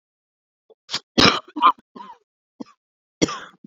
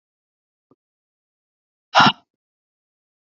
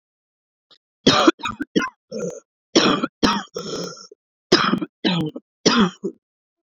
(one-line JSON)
{"cough_length": "3.7 s", "cough_amplitude": 32768, "cough_signal_mean_std_ratio": 0.27, "exhalation_length": "3.2 s", "exhalation_amplitude": 28759, "exhalation_signal_mean_std_ratio": 0.18, "three_cough_length": "6.7 s", "three_cough_amplitude": 30830, "three_cough_signal_mean_std_ratio": 0.44, "survey_phase": "beta (2021-08-13 to 2022-03-07)", "age": "45-64", "gender": "Female", "wearing_mask": "No", "symptom_cough_any": true, "symptom_new_continuous_cough": true, "symptom_runny_or_blocked_nose": true, "symptom_shortness_of_breath": true, "symptom_fatigue": true, "symptom_fever_high_temperature": true, "symptom_headache": true, "symptom_change_to_sense_of_smell_or_taste": true, "symptom_loss_of_taste": true, "symptom_other": true, "smoker_status": "Never smoked", "respiratory_condition_asthma": false, "respiratory_condition_other": false, "recruitment_source": "Test and Trace", "submission_delay": "2 days", "covid_test_result": "Positive", "covid_test_method": "RT-qPCR", "covid_ct_value": 22.0, "covid_ct_gene": "ORF1ab gene", "covid_ct_mean": 22.5, "covid_viral_load": "43000 copies/ml", "covid_viral_load_category": "Low viral load (10K-1M copies/ml)"}